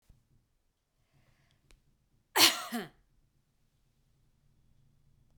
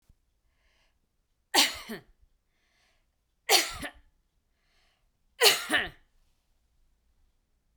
{
  "cough_length": "5.4 s",
  "cough_amplitude": 13869,
  "cough_signal_mean_std_ratio": 0.18,
  "three_cough_length": "7.8 s",
  "three_cough_amplitude": 19834,
  "three_cough_signal_mean_std_ratio": 0.25,
  "survey_phase": "beta (2021-08-13 to 2022-03-07)",
  "age": "45-64",
  "gender": "Female",
  "wearing_mask": "No",
  "symptom_none": true,
  "smoker_status": "Ex-smoker",
  "respiratory_condition_asthma": false,
  "respiratory_condition_other": false,
  "recruitment_source": "REACT",
  "submission_delay": "1 day",
  "covid_test_result": "Negative",
  "covid_test_method": "RT-qPCR",
  "influenza_a_test_result": "Negative",
  "influenza_b_test_result": "Negative"
}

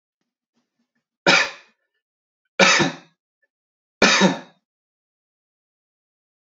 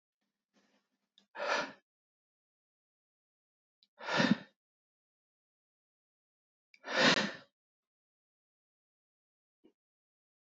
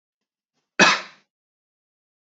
{
  "three_cough_length": "6.6 s",
  "three_cough_amplitude": 30207,
  "three_cough_signal_mean_std_ratio": 0.29,
  "exhalation_length": "10.5 s",
  "exhalation_amplitude": 6686,
  "exhalation_signal_mean_std_ratio": 0.23,
  "cough_length": "2.3 s",
  "cough_amplitude": 27057,
  "cough_signal_mean_std_ratio": 0.22,
  "survey_phase": "beta (2021-08-13 to 2022-03-07)",
  "age": "18-44",
  "gender": "Male",
  "wearing_mask": "No",
  "symptom_runny_or_blocked_nose": true,
  "symptom_sore_throat": true,
  "symptom_fatigue": true,
  "symptom_headache": true,
  "smoker_status": "Never smoked",
  "respiratory_condition_asthma": false,
  "respiratory_condition_other": false,
  "recruitment_source": "Test and Trace",
  "submission_delay": "1 day",
  "covid_test_result": "Positive",
  "covid_test_method": "RT-qPCR"
}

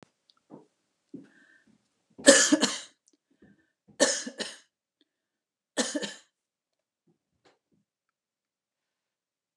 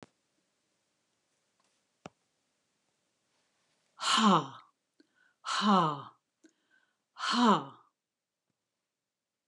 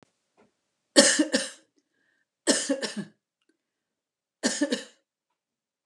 {
  "three_cough_length": "9.6 s",
  "three_cough_amplitude": 31176,
  "three_cough_signal_mean_std_ratio": 0.22,
  "exhalation_length": "9.5 s",
  "exhalation_amplitude": 8258,
  "exhalation_signal_mean_std_ratio": 0.29,
  "cough_length": "5.9 s",
  "cough_amplitude": 26328,
  "cough_signal_mean_std_ratio": 0.31,
  "survey_phase": "beta (2021-08-13 to 2022-03-07)",
  "age": "65+",
  "gender": "Female",
  "wearing_mask": "No",
  "symptom_none": true,
  "smoker_status": "Never smoked",
  "respiratory_condition_asthma": false,
  "respiratory_condition_other": false,
  "recruitment_source": "REACT",
  "submission_delay": "1 day",
  "covid_test_result": "Negative",
  "covid_test_method": "RT-qPCR"
}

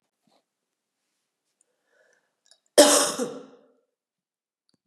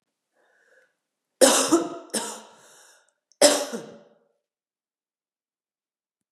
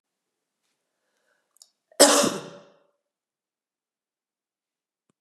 {
  "cough_length": "4.9 s",
  "cough_amplitude": 30744,
  "cough_signal_mean_std_ratio": 0.22,
  "three_cough_length": "6.3 s",
  "three_cough_amplitude": 27596,
  "three_cough_signal_mean_std_ratio": 0.28,
  "exhalation_length": "5.2 s",
  "exhalation_amplitude": 32767,
  "exhalation_signal_mean_std_ratio": 0.19,
  "survey_phase": "beta (2021-08-13 to 2022-03-07)",
  "age": "45-64",
  "gender": "Female",
  "wearing_mask": "No",
  "symptom_cough_any": true,
  "symptom_runny_or_blocked_nose": true,
  "symptom_sore_throat": true,
  "smoker_status": "Never smoked",
  "respiratory_condition_asthma": false,
  "respiratory_condition_other": false,
  "recruitment_source": "Test and Trace",
  "submission_delay": "2 days",
  "covid_test_result": "Positive",
  "covid_test_method": "RT-qPCR",
  "covid_ct_value": 23.9,
  "covid_ct_gene": "N gene"
}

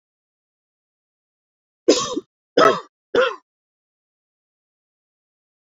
{
  "three_cough_length": "5.7 s",
  "three_cough_amplitude": 26956,
  "three_cough_signal_mean_std_ratio": 0.24,
  "survey_phase": "beta (2021-08-13 to 2022-03-07)",
  "age": "18-44",
  "gender": "Female",
  "wearing_mask": "No",
  "symptom_shortness_of_breath": true,
  "symptom_sore_throat": true,
  "symptom_diarrhoea": true,
  "symptom_fatigue": true,
  "smoker_status": "Never smoked",
  "respiratory_condition_asthma": false,
  "respiratory_condition_other": false,
  "recruitment_source": "Test and Trace",
  "submission_delay": "1 day",
  "covid_test_result": "Positive",
  "covid_test_method": "RT-qPCR",
  "covid_ct_value": 29.8,
  "covid_ct_gene": "ORF1ab gene",
  "covid_ct_mean": 30.7,
  "covid_viral_load": "84 copies/ml",
  "covid_viral_load_category": "Minimal viral load (< 10K copies/ml)"
}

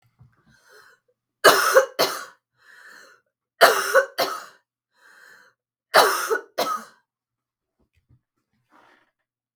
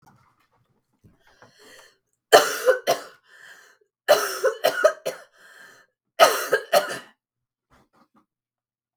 {
  "three_cough_length": "9.6 s",
  "three_cough_amplitude": 32768,
  "three_cough_signal_mean_std_ratio": 0.31,
  "cough_length": "9.0 s",
  "cough_amplitude": 32768,
  "cough_signal_mean_std_ratio": 0.31,
  "survey_phase": "beta (2021-08-13 to 2022-03-07)",
  "age": "45-64",
  "gender": "Female",
  "wearing_mask": "No",
  "symptom_new_continuous_cough": true,
  "symptom_runny_or_blocked_nose": true,
  "symptom_shortness_of_breath": true,
  "symptom_fatigue": true,
  "symptom_headache": true,
  "symptom_change_to_sense_of_smell_or_taste": true,
  "symptom_onset": "3 days",
  "smoker_status": "Never smoked",
  "respiratory_condition_asthma": false,
  "respiratory_condition_other": false,
  "recruitment_source": "Test and Trace",
  "submission_delay": "1 day",
  "covid_test_result": "Positive",
  "covid_test_method": "RT-qPCR",
  "covid_ct_value": 21.6,
  "covid_ct_gene": "ORF1ab gene"
}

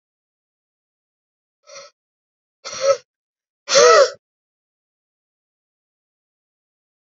{
  "exhalation_length": "7.2 s",
  "exhalation_amplitude": 30532,
  "exhalation_signal_mean_std_ratio": 0.23,
  "survey_phase": "beta (2021-08-13 to 2022-03-07)",
  "age": "18-44",
  "gender": "Male",
  "wearing_mask": "No",
  "symptom_cough_any": true,
  "symptom_runny_or_blocked_nose": true,
  "symptom_sore_throat": true,
  "symptom_abdominal_pain": true,
  "symptom_fatigue": true,
  "symptom_change_to_sense_of_smell_or_taste": true,
  "smoker_status": "Never smoked",
  "respiratory_condition_asthma": true,
  "respiratory_condition_other": false,
  "recruitment_source": "Test and Trace",
  "submission_delay": "2 days",
  "covid_test_result": "Positive",
  "covid_test_method": "LFT"
}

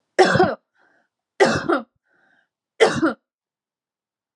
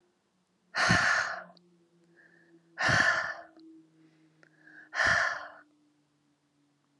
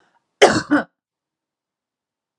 {
  "three_cough_length": "4.4 s",
  "three_cough_amplitude": 31706,
  "three_cough_signal_mean_std_ratio": 0.37,
  "exhalation_length": "7.0 s",
  "exhalation_amplitude": 9913,
  "exhalation_signal_mean_std_ratio": 0.41,
  "cough_length": "2.4 s",
  "cough_amplitude": 32768,
  "cough_signal_mean_std_ratio": 0.26,
  "survey_phase": "beta (2021-08-13 to 2022-03-07)",
  "age": "45-64",
  "gender": "Female",
  "wearing_mask": "No",
  "symptom_cough_any": true,
  "symptom_new_continuous_cough": true,
  "symptom_runny_or_blocked_nose": true,
  "symptom_shortness_of_breath": true,
  "symptom_fatigue": true,
  "symptom_onset": "3 days",
  "smoker_status": "Never smoked",
  "respiratory_condition_asthma": false,
  "respiratory_condition_other": false,
  "recruitment_source": "Test and Trace",
  "submission_delay": "2 days",
  "covid_test_result": "Positive",
  "covid_test_method": "RT-qPCR",
  "covid_ct_value": 29.4,
  "covid_ct_gene": "N gene"
}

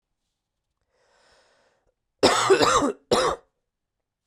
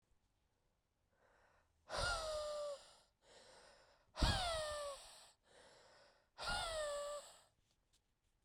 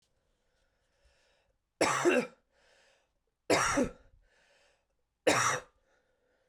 {
  "cough_length": "4.3 s",
  "cough_amplitude": 26570,
  "cough_signal_mean_std_ratio": 0.37,
  "exhalation_length": "8.4 s",
  "exhalation_amplitude": 2891,
  "exhalation_signal_mean_std_ratio": 0.48,
  "three_cough_length": "6.5 s",
  "three_cough_amplitude": 8167,
  "three_cough_signal_mean_std_ratio": 0.34,
  "survey_phase": "beta (2021-08-13 to 2022-03-07)",
  "age": "18-44",
  "gender": "Male",
  "wearing_mask": "No",
  "symptom_cough_any": true,
  "symptom_runny_or_blocked_nose": true,
  "symptom_shortness_of_breath": true,
  "symptom_sore_throat": true,
  "symptom_diarrhoea": true,
  "symptom_fatigue": true,
  "symptom_fever_high_temperature": true,
  "symptom_headache": true,
  "symptom_change_to_sense_of_smell_or_taste": true,
  "symptom_loss_of_taste": true,
  "symptom_onset": "4 days",
  "smoker_status": "Ex-smoker",
  "respiratory_condition_asthma": true,
  "respiratory_condition_other": false,
  "recruitment_source": "Test and Trace",
  "submission_delay": "3 days",
  "covid_test_result": "Positive",
  "covid_test_method": "RT-qPCR",
  "covid_ct_value": 20.6,
  "covid_ct_gene": "ORF1ab gene",
  "covid_ct_mean": 21.7,
  "covid_viral_load": "75000 copies/ml",
  "covid_viral_load_category": "Low viral load (10K-1M copies/ml)"
}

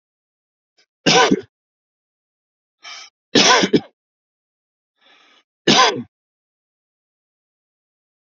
{
  "three_cough_length": "8.4 s",
  "three_cough_amplitude": 31858,
  "three_cough_signal_mean_std_ratio": 0.28,
  "survey_phase": "alpha (2021-03-01 to 2021-08-12)",
  "age": "45-64",
  "gender": "Male",
  "wearing_mask": "No",
  "symptom_none": true,
  "smoker_status": "Ex-smoker",
  "respiratory_condition_asthma": false,
  "respiratory_condition_other": false,
  "recruitment_source": "REACT",
  "submission_delay": "4 days",
  "covid_test_result": "Negative",
  "covid_test_method": "RT-qPCR"
}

